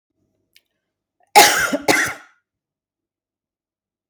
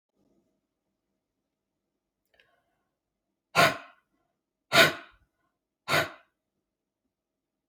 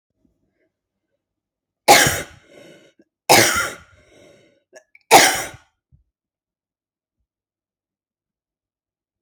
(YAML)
cough_length: 4.1 s
cough_amplitude: 32768
cough_signal_mean_std_ratio: 0.28
exhalation_length: 7.7 s
exhalation_amplitude: 16410
exhalation_signal_mean_std_ratio: 0.2
three_cough_length: 9.2 s
three_cough_amplitude: 32768
three_cough_signal_mean_std_ratio: 0.25
survey_phase: alpha (2021-03-01 to 2021-08-12)
age: 45-64
gender: Female
wearing_mask: 'No'
symptom_none: true
smoker_status: Never smoked
respiratory_condition_asthma: false
respiratory_condition_other: false
recruitment_source: REACT
submission_delay: 2 days
covid_test_result: Negative
covid_test_method: RT-qPCR